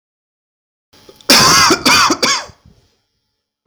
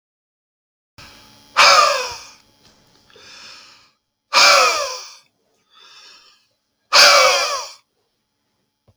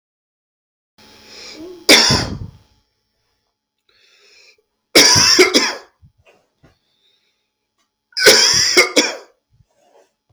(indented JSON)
{
  "cough_length": "3.7 s",
  "cough_amplitude": 32768,
  "cough_signal_mean_std_ratio": 0.47,
  "exhalation_length": "9.0 s",
  "exhalation_amplitude": 32768,
  "exhalation_signal_mean_std_ratio": 0.36,
  "three_cough_length": "10.3 s",
  "three_cough_amplitude": 32768,
  "three_cough_signal_mean_std_ratio": 0.36,
  "survey_phase": "beta (2021-08-13 to 2022-03-07)",
  "age": "45-64",
  "gender": "Male",
  "wearing_mask": "No",
  "symptom_none": true,
  "smoker_status": "Ex-smoker",
  "respiratory_condition_asthma": false,
  "respiratory_condition_other": false,
  "recruitment_source": "REACT",
  "submission_delay": "2 days",
  "covid_test_result": "Negative",
  "covid_test_method": "RT-qPCR",
  "influenza_a_test_result": "Negative",
  "influenza_b_test_result": "Negative"
}